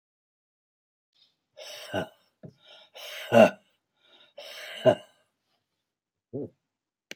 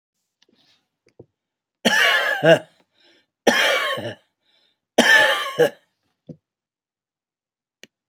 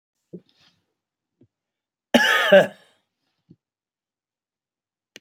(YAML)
exhalation_length: 7.2 s
exhalation_amplitude: 19639
exhalation_signal_mean_std_ratio: 0.21
three_cough_length: 8.1 s
three_cough_amplitude: 28184
three_cough_signal_mean_std_ratio: 0.38
cough_length: 5.2 s
cough_amplitude: 27643
cough_signal_mean_std_ratio: 0.23
survey_phase: beta (2021-08-13 to 2022-03-07)
age: 45-64
gender: Male
wearing_mask: 'No'
symptom_none: true
smoker_status: Never smoked
respiratory_condition_asthma: false
respiratory_condition_other: false
recruitment_source: REACT
submission_delay: 1 day
covid_test_result: Negative
covid_test_method: RT-qPCR